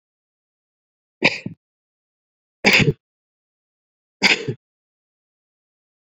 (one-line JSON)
{"three_cough_length": "6.1 s", "three_cough_amplitude": 29484, "three_cough_signal_mean_std_ratio": 0.24, "survey_phase": "beta (2021-08-13 to 2022-03-07)", "age": "45-64", "gender": "Male", "wearing_mask": "No", "symptom_none": true, "smoker_status": "Never smoked", "respiratory_condition_asthma": false, "respiratory_condition_other": false, "recruitment_source": "REACT", "submission_delay": "1 day", "covid_test_result": "Negative", "covid_test_method": "RT-qPCR"}